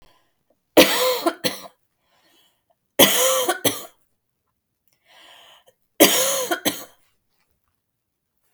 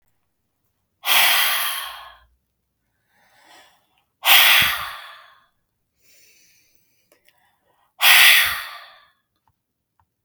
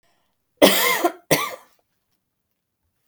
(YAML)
three_cough_length: 8.5 s
three_cough_amplitude: 32768
three_cough_signal_mean_std_ratio: 0.34
exhalation_length: 10.2 s
exhalation_amplitude: 32768
exhalation_signal_mean_std_ratio: 0.34
cough_length: 3.1 s
cough_amplitude: 32768
cough_signal_mean_std_ratio: 0.34
survey_phase: beta (2021-08-13 to 2022-03-07)
age: 18-44
gender: Female
wearing_mask: 'No'
symptom_fatigue: true
smoker_status: Never smoked
respiratory_condition_asthma: false
respiratory_condition_other: false
recruitment_source: REACT
submission_delay: 3 days
covid_test_result: Negative
covid_test_method: RT-qPCR
influenza_a_test_result: Negative
influenza_b_test_result: Negative